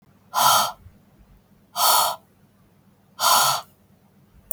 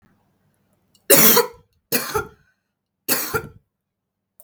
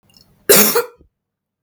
{"exhalation_length": "4.5 s", "exhalation_amplitude": 31578, "exhalation_signal_mean_std_ratio": 0.43, "three_cough_length": "4.4 s", "three_cough_amplitude": 32768, "three_cough_signal_mean_std_ratio": 0.32, "cough_length": "1.6 s", "cough_amplitude": 32768, "cough_signal_mean_std_ratio": 0.37, "survey_phase": "beta (2021-08-13 to 2022-03-07)", "age": "18-44", "gender": "Female", "wearing_mask": "No", "symptom_cough_any": true, "symptom_runny_or_blocked_nose": true, "symptom_sore_throat": true, "symptom_fatigue": true, "symptom_onset": "12 days", "smoker_status": "Never smoked", "respiratory_condition_asthma": false, "respiratory_condition_other": false, "recruitment_source": "REACT", "submission_delay": "1 day", "covid_test_result": "Negative", "covid_test_method": "RT-qPCR"}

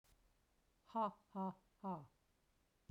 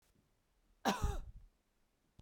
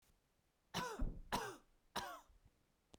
{"exhalation_length": "2.9 s", "exhalation_amplitude": 1047, "exhalation_signal_mean_std_ratio": 0.38, "cough_length": "2.2 s", "cough_amplitude": 3914, "cough_signal_mean_std_ratio": 0.34, "three_cough_length": "3.0 s", "three_cough_amplitude": 1263, "three_cough_signal_mean_std_ratio": 0.45, "survey_phase": "beta (2021-08-13 to 2022-03-07)", "age": "45-64", "gender": "Female", "wearing_mask": "No", "symptom_none": true, "smoker_status": "Ex-smoker", "respiratory_condition_asthma": false, "respiratory_condition_other": false, "recruitment_source": "REACT", "submission_delay": "3 days", "covid_test_result": "Negative", "covid_test_method": "RT-qPCR"}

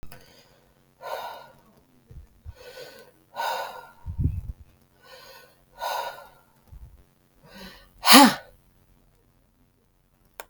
{"exhalation_length": "10.5 s", "exhalation_amplitude": 32768, "exhalation_signal_mean_std_ratio": 0.24, "survey_phase": "beta (2021-08-13 to 2022-03-07)", "age": "45-64", "gender": "Female", "wearing_mask": "No", "symptom_runny_or_blocked_nose": true, "symptom_shortness_of_breath": true, "symptom_fatigue": true, "symptom_onset": "12 days", "smoker_status": "Never smoked", "respiratory_condition_asthma": false, "respiratory_condition_other": false, "recruitment_source": "REACT", "submission_delay": "2 days", "covid_test_result": "Negative", "covid_test_method": "RT-qPCR", "covid_ct_value": 38.8, "covid_ct_gene": "E gene", "influenza_a_test_result": "Negative", "influenza_b_test_result": "Negative"}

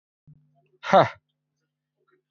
{"exhalation_length": "2.3 s", "exhalation_amplitude": 17920, "exhalation_signal_mean_std_ratio": 0.21, "survey_phase": "alpha (2021-03-01 to 2021-08-12)", "age": "18-44", "gender": "Male", "wearing_mask": "No", "symptom_none": true, "smoker_status": "Current smoker (1 to 10 cigarettes per day)", "respiratory_condition_asthma": true, "respiratory_condition_other": false, "recruitment_source": "REACT", "submission_delay": "2 days", "covid_test_result": "Negative", "covid_test_method": "RT-qPCR"}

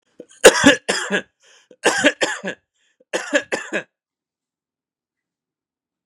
{"three_cough_length": "6.1 s", "three_cough_amplitude": 32768, "three_cough_signal_mean_std_ratio": 0.31, "survey_phase": "beta (2021-08-13 to 2022-03-07)", "age": "45-64", "gender": "Male", "wearing_mask": "No", "symptom_runny_or_blocked_nose": true, "symptom_sore_throat": true, "symptom_fatigue": true, "symptom_fever_high_temperature": true, "symptom_headache": true, "symptom_change_to_sense_of_smell_or_taste": true, "symptom_onset": "4 days", "smoker_status": "Never smoked", "respiratory_condition_asthma": false, "respiratory_condition_other": false, "recruitment_source": "Test and Trace", "submission_delay": "2 days", "covid_test_result": "Positive", "covid_test_method": "ePCR"}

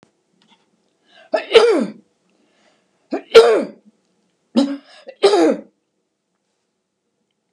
{"three_cough_length": "7.5 s", "three_cough_amplitude": 32768, "three_cough_signal_mean_std_ratio": 0.32, "survey_phase": "beta (2021-08-13 to 2022-03-07)", "age": "65+", "gender": "Female", "wearing_mask": "No", "symptom_none": true, "symptom_onset": "13 days", "smoker_status": "Never smoked", "respiratory_condition_asthma": false, "respiratory_condition_other": false, "recruitment_source": "REACT", "submission_delay": "3 days", "covid_test_result": "Negative", "covid_test_method": "RT-qPCR", "influenza_a_test_result": "Negative", "influenza_b_test_result": "Negative"}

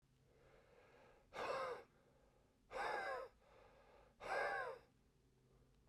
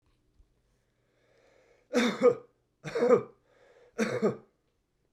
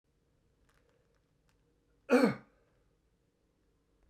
{"exhalation_length": "5.9 s", "exhalation_amplitude": 935, "exhalation_signal_mean_std_ratio": 0.5, "three_cough_length": "5.1 s", "three_cough_amplitude": 9610, "three_cough_signal_mean_std_ratio": 0.35, "cough_length": "4.1 s", "cough_amplitude": 6796, "cough_signal_mean_std_ratio": 0.2, "survey_phase": "beta (2021-08-13 to 2022-03-07)", "age": "18-44", "gender": "Male", "wearing_mask": "Yes", "symptom_cough_any": true, "symptom_runny_or_blocked_nose": true, "symptom_sore_throat": true, "symptom_fatigue": true, "symptom_headache": true, "symptom_onset": "4 days", "smoker_status": "Ex-smoker", "respiratory_condition_asthma": false, "respiratory_condition_other": false, "recruitment_source": "Test and Trace", "submission_delay": "2 days", "covid_test_result": "Positive", "covid_test_method": "RT-qPCR", "covid_ct_value": 13.6, "covid_ct_gene": "N gene", "covid_ct_mean": 13.8, "covid_viral_load": "29000000 copies/ml", "covid_viral_load_category": "High viral load (>1M copies/ml)"}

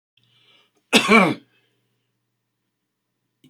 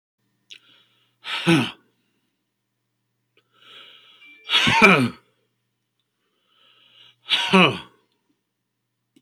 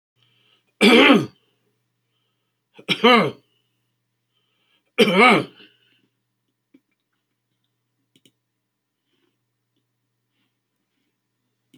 {"cough_length": "3.5 s", "cough_amplitude": 29724, "cough_signal_mean_std_ratio": 0.26, "exhalation_length": "9.2 s", "exhalation_amplitude": 30222, "exhalation_signal_mean_std_ratio": 0.29, "three_cough_length": "11.8 s", "three_cough_amplitude": 28358, "three_cough_signal_mean_std_ratio": 0.25, "survey_phase": "alpha (2021-03-01 to 2021-08-12)", "age": "65+", "gender": "Male", "wearing_mask": "No", "symptom_none": true, "smoker_status": "Never smoked", "respiratory_condition_asthma": false, "respiratory_condition_other": false, "recruitment_source": "REACT", "submission_delay": "2 days", "covid_test_result": "Negative", "covid_test_method": "RT-qPCR"}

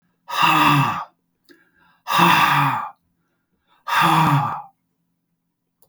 {"exhalation_length": "5.9 s", "exhalation_amplitude": 30900, "exhalation_signal_mean_std_ratio": 0.52, "survey_phase": "beta (2021-08-13 to 2022-03-07)", "age": "65+", "gender": "Male", "wearing_mask": "No", "symptom_none": true, "smoker_status": "Ex-smoker", "respiratory_condition_asthma": false, "respiratory_condition_other": false, "recruitment_source": "REACT", "submission_delay": "3 days", "covid_test_result": "Negative", "covid_test_method": "RT-qPCR"}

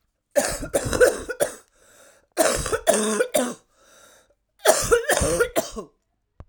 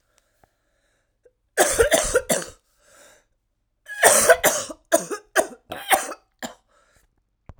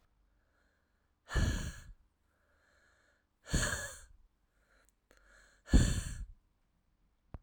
{"cough_length": "6.5 s", "cough_amplitude": 27278, "cough_signal_mean_std_ratio": 0.51, "three_cough_length": "7.6 s", "three_cough_amplitude": 32768, "three_cough_signal_mean_std_ratio": 0.37, "exhalation_length": "7.4 s", "exhalation_amplitude": 9018, "exhalation_signal_mean_std_ratio": 0.3, "survey_phase": "alpha (2021-03-01 to 2021-08-12)", "age": "45-64", "gender": "Female", "wearing_mask": "No", "symptom_cough_any": true, "symptom_new_continuous_cough": true, "symptom_shortness_of_breath": true, "symptom_abdominal_pain": true, "symptom_diarrhoea": true, "symptom_fatigue": true, "symptom_fever_high_temperature": true, "symptom_headache": true, "symptom_change_to_sense_of_smell_or_taste": true, "symptom_loss_of_taste": true, "symptom_onset": "7 days", "smoker_status": "Ex-smoker", "respiratory_condition_asthma": false, "respiratory_condition_other": false, "recruitment_source": "Test and Trace", "submission_delay": "2 days", "covid_test_result": "Positive", "covid_test_method": "RT-qPCR"}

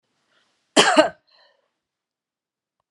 {"cough_length": "2.9 s", "cough_amplitude": 32747, "cough_signal_mean_std_ratio": 0.24, "survey_phase": "alpha (2021-03-01 to 2021-08-12)", "age": "65+", "gender": "Female", "wearing_mask": "No", "symptom_shortness_of_breath": true, "symptom_fatigue": true, "symptom_onset": "12 days", "smoker_status": "Never smoked", "respiratory_condition_asthma": false, "respiratory_condition_other": false, "recruitment_source": "REACT", "submission_delay": "1 day", "covid_test_result": "Negative", "covid_test_method": "RT-qPCR"}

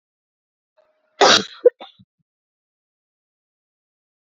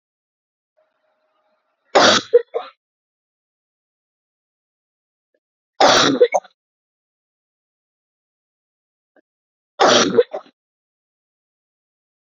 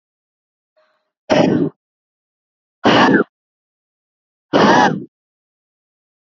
{"cough_length": "4.3 s", "cough_amplitude": 30457, "cough_signal_mean_std_ratio": 0.19, "three_cough_length": "12.4 s", "three_cough_amplitude": 32052, "three_cough_signal_mean_std_ratio": 0.25, "exhalation_length": "6.3 s", "exhalation_amplitude": 31500, "exhalation_signal_mean_std_ratio": 0.36, "survey_phase": "beta (2021-08-13 to 2022-03-07)", "age": "18-44", "gender": "Female", "wearing_mask": "No", "symptom_cough_any": true, "symptom_runny_or_blocked_nose": true, "symptom_sore_throat": true, "symptom_headache": true, "smoker_status": "Never smoked", "respiratory_condition_asthma": true, "respiratory_condition_other": false, "recruitment_source": "Test and Trace", "submission_delay": "2 days", "covid_test_result": "Positive", "covid_test_method": "LFT"}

